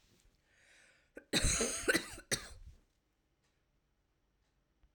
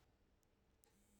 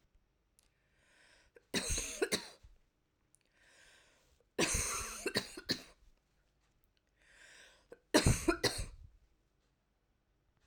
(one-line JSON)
{"cough_length": "4.9 s", "cough_amplitude": 4318, "cough_signal_mean_std_ratio": 0.33, "exhalation_length": "1.2 s", "exhalation_amplitude": 174, "exhalation_signal_mean_std_ratio": 1.03, "three_cough_length": "10.7 s", "three_cough_amplitude": 7268, "three_cough_signal_mean_std_ratio": 0.33, "survey_phase": "beta (2021-08-13 to 2022-03-07)", "age": "45-64", "gender": "Female", "wearing_mask": "No", "symptom_cough_any": true, "symptom_runny_or_blocked_nose": true, "symptom_headache": true, "smoker_status": "Ex-smoker", "respiratory_condition_asthma": false, "respiratory_condition_other": false, "recruitment_source": "REACT", "submission_delay": "2 days", "covid_test_result": "Negative", "covid_test_method": "RT-qPCR", "influenza_a_test_result": "Negative", "influenza_b_test_result": "Negative"}